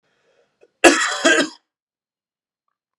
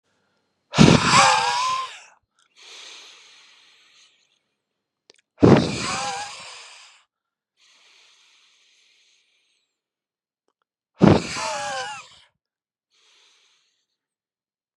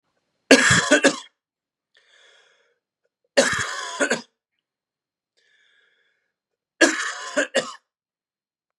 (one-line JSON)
{"cough_length": "3.0 s", "cough_amplitude": 32768, "cough_signal_mean_std_ratio": 0.32, "exhalation_length": "14.8 s", "exhalation_amplitude": 32768, "exhalation_signal_mean_std_ratio": 0.29, "three_cough_length": "8.8 s", "three_cough_amplitude": 32767, "three_cough_signal_mean_std_ratio": 0.32, "survey_phase": "beta (2021-08-13 to 2022-03-07)", "age": "18-44", "gender": "Male", "wearing_mask": "No", "symptom_none": true, "symptom_onset": "3 days", "smoker_status": "Never smoked", "respiratory_condition_asthma": false, "respiratory_condition_other": false, "recruitment_source": "Test and Trace", "submission_delay": "2 days", "covid_test_result": "Positive", "covid_test_method": "RT-qPCR", "covid_ct_value": 19.8, "covid_ct_gene": "ORF1ab gene", "covid_ct_mean": 20.2, "covid_viral_load": "230000 copies/ml", "covid_viral_load_category": "Low viral load (10K-1M copies/ml)"}